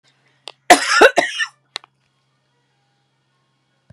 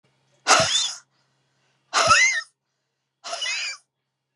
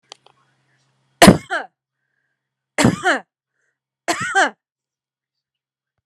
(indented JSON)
{
  "cough_length": "3.9 s",
  "cough_amplitude": 32768,
  "cough_signal_mean_std_ratio": 0.27,
  "exhalation_length": "4.4 s",
  "exhalation_amplitude": 28305,
  "exhalation_signal_mean_std_ratio": 0.42,
  "three_cough_length": "6.1 s",
  "three_cough_amplitude": 32768,
  "three_cough_signal_mean_std_ratio": 0.26,
  "survey_phase": "beta (2021-08-13 to 2022-03-07)",
  "age": "45-64",
  "gender": "Female",
  "wearing_mask": "No",
  "symptom_none": true,
  "smoker_status": "Never smoked",
  "respiratory_condition_asthma": false,
  "respiratory_condition_other": false,
  "recruitment_source": "REACT",
  "submission_delay": "1 day",
  "covid_test_result": "Negative",
  "covid_test_method": "RT-qPCR"
}